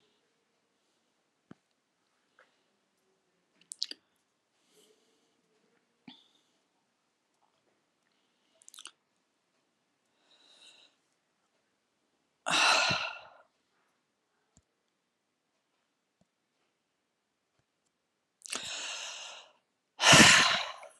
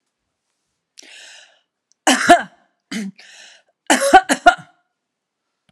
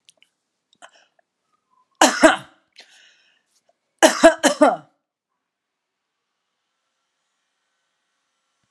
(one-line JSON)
{"exhalation_length": "21.0 s", "exhalation_amplitude": 19704, "exhalation_signal_mean_std_ratio": 0.2, "cough_length": "5.7 s", "cough_amplitude": 32768, "cough_signal_mean_std_ratio": 0.28, "three_cough_length": "8.7 s", "three_cough_amplitude": 32767, "three_cough_signal_mean_std_ratio": 0.22, "survey_phase": "alpha (2021-03-01 to 2021-08-12)", "age": "45-64", "gender": "Female", "wearing_mask": "No", "symptom_none": true, "smoker_status": "Ex-smoker", "respiratory_condition_asthma": false, "respiratory_condition_other": false, "recruitment_source": "REACT", "submission_delay": "1 day", "covid_test_result": "Negative", "covid_test_method": "RT-qPCR"}